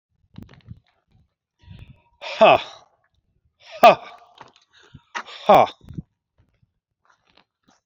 {"exhalation_length": "7.9 s", "exhalation_amplitude": 27696, "exhalation_signal_mean_std_ratio": 0.23, "survey_phase": "beta (2021-08-13 to 2022-03-07)", "age": "45-64", "gender": "Male", "wearing_mask": "No", "symptom_cough_any": true, "symptom_new_continuous_cough": true, "symptom_sore_throat": true, "symptom_onset": "11 days", "smoker_status": "Never smoked", "respiratory_condition_asthma": false, "respiratory_condition_other": false, "recruitment_source": "REACT", "submission_delay": "1 day", "covid_test_result": "Negative", "covid_test_method": "RT-qPCR", "covid_ct_value": 38.0, "covid_ct_gene": "E gene"}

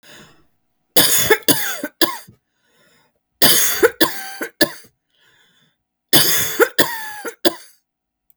{"three_cough_length": "8.4 s", "three_cough_amplitude": 32768, "three_cough_signal_mean_std_ratio": 0.42, "survey_phase": "beta (2021-08-13 to 2022-03-07)", "age": "45-64", "gender": "Female", "wearing_mask": "No", "symptom_cough_any": true, "symptom_sore_throat": true, "symptom_fatigue": true, "symptom_headache": true, "symptom_onset": "5 days", "smoker_status": "Ex-smoker", "respiratory_condition_asthma": false, "respiratory_condition_other": false, "recruitment_source": "REACT", "submission_delay": "3 days", "covid_test_result": "Negative", "covid_test_method": "RT-qPCR", "influenza_a_test_result": "Negative", "influenza_b_test_result": "Negative"}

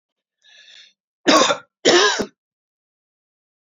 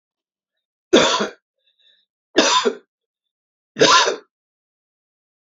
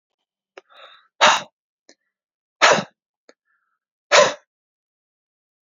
{"cough_length": "3.7 s", "cough_amplitude": 31726, "cough_signal_mean_std_ratio": 0.34, "three_cough_length": "5.5 s", "three_cough_amplitude": 32768, "three_cough_signal_mean_std_ratio": 0.34, "exhalation_length": "5.6 s", "exhalation_amplitude": 29352, "exhalation_signal_mean_std_ratio": 0.25, "survey_phase": "alpha (2021-03-01 to 2021-08-12)", "age": "45-64", "gender": "Male", "wearing_mask": "No", "symptom_none": true, "smoker_status": "Current smoker (e-cigarettes or vapes only)", "respiratory_condition_asthma": false, "respiratory_condition_other": false, "recruitment_source": "REACT", "submission_delay": "3 days", "covid_test_result": "Negative", "covid_test_method": "RT-qPCR"}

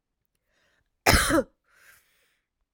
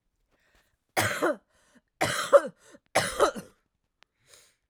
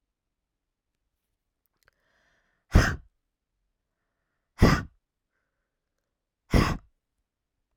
{"cough_length": "2.7 s", "cough_amplitude": 26297, "cough_signal_mean_std_ratio": 0.28, "three_cough_length": "4.7 s", "three_cough_amplitude": 18247, "three_cough_signal_mean_std_ratio": 0.33, "exhalation_length": "7.8 s", "exhalation_amplitude": 20236, "exhalation_signal_mean_std_ratio": 0.2, "survey_phase": "beta (2021-08-13 to 2022-03-07)", "age": "18-44", "gender": "Female", "wearing_mask": "No", "symptom_cough_any": true, "symptom_runny_or_blocked_nose": true, "symptom_sore_throat": true, "symptom_fatigue": true, "symptom_headache": true, "symptom_other": true, "symptom_onset": "4 days", "smoker_status": "Never smoked", "respiratory_condition_asthma": false, "respiratory_condition_other": false, "recruitment_source": "Test and Trace", "submission_delay": "3 days", "covid_test_result": "Positive", "covid_test_method": "RT-qPCR", "covid_ct_value": 17.7, "covid_ct_gene": "ORF1ab gene", "covid_ct_mean": 18.1, "covid_viral_load": "1100000 copies/ml", "covid_viral_load_category": "High viral load (>1M copies/ml)"}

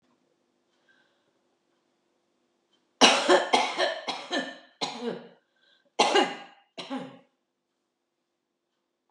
{"cough_length": "9.1 s", "cough_amplitude": 22959, "cough_signal_mean_std_ratio": 0.32, "survey_phase": "beta (2021-08-13 to 2022-03-07)", "age": "65+", "gender": "Female", "wearing_mask": "No", "symptom_abdominal_pain": true, "symptom_fatigue": true, "symptom_change_to_sense_of_smell_or_taste": true, "symptom_loss_of_taste": true, "smoker_status": "Ex-smoker", "respiratory_condition_asthma": false, "respiratory_condition_other": false, "recruitment_source": "REACT", "submission_delay": "2 days", "covid_test_result": "Negative", "covid_test_method": "RT-qPCR", "influenza_a_test_result": "Unknown/Void", "influenza_b_test_result": "Unknown/Void"}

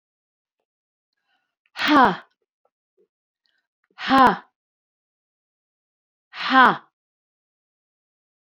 {"exhalation_length": "8.5 s", "exhalation_amplitude": 27833, "exhalation_signal_mean_std_ratio": 0.24, "survey_phase": "beta (2021-08-13 to 2022-03-07)", "age": "65+", "gender": "Female", "wearing_mask": "No", "symptom_none": true, "smoker_status": "Never smoked", "respiratory_condition_asthma": false, "respiratory_condition_other": false, "recruitment_source": "REACT", "submission_delay": "2 days", "covid_test_result": "Negative", "covid_test_method": "RT-qPCR"}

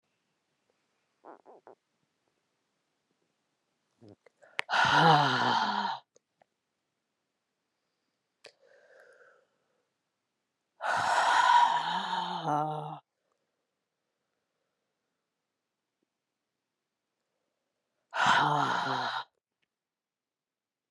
{"exhalation_length": "20.9 s", "exhalation_amplitude": 11500, "exhalation_signal_mean_std_ratio": 0.35, "survey_phase": "beta (2021-08-13 to 2022-03-07)", "age": "18-44", "gender": "Female", "wearing_mask": "No", "symptom_cough_any": true, "symptom_runny_or_blocked_nose": true, "symptom_sore_throat": true, "symptom_fatigue": true, "symptom_headache": true, "symptom_onset": "3 days", "smoker_status": "Ex-smoker", "respiratory_condition_asthma": false, "respiratory_condition_other": false, "recruitment_source": "Test and Trace", "submission_delay": "2 days", "covid_test_result": "Positive", "covid_test_method": "ePCR"}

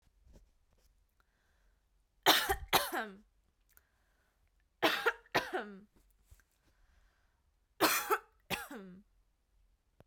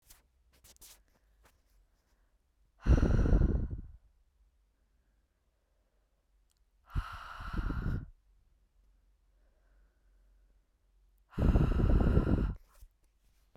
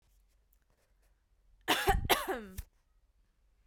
{"three_cough_length": "10.1 s", "three_cough_amplitude": 9317, "three_cough_signal_mean_std_ratio": 0.3, "exhalation_length": "13.6 s", "exhalation_amplitude": 7176, "exhalation_signal_mean_std_ratio": 0.36, "cough_length": "3.7 s", "cough_amplitude": 11063, "cough_signal_mean_std_ratio": 0.33, "survey_phase": "beta (2021-08-13 to 2022-03-07)", "age": "18-44", "gender": "Female", "wearing_mask": "No", "symptom_none": true, "smoker_status": "Never smoked", "respiratory_condition_asthma": false, "respiratory_condition_other": false, "recruitment_source": "REACT", "submission_delay": "3 days", "covid_test_result": "Negative", "covid_test_method": "RT-qPCR"}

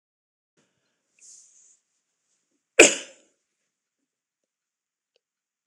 {"cough_length": "5.7 s", "cough_amplitude": 26028, "cough_signal_mean_std_ratio": 0.12, "survey_phase": "alpha (2021-03-01 to 2021-08-12)", "age": "65+", "gender": "Male", "wearing_mask": "No", "symptom_none": true, "smoker_status": "Never smoked", "respiratory_condition_asthma": false, "respiratory_condition_other": false, "recruitment_source": "REACT", "submission_delay": "2 days", "covid_test_result": "Negative", "covid_test_method": "RT-qPCR"}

